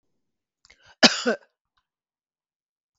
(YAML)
cough_length: 3.0 s
cough_amplitude: 32768
cough_signal_mean_std_ratio: 0.18
survey_phase: beta (2021-08-13 to 2022-03-07)
age: 65+
gender: Female
wearing_mask: 'No'
symptom_none: true
smoker_status: Ex-smoker
respiratory_condition_asthma: false
respiratory_condition_other: false
recruitment_source: REACT
submission_delay: 1 day
covid_test_result: Negative
covid_test_method: RT-qPCR
influenza_a_test_result: Negative
influenza_b_test_result: Negative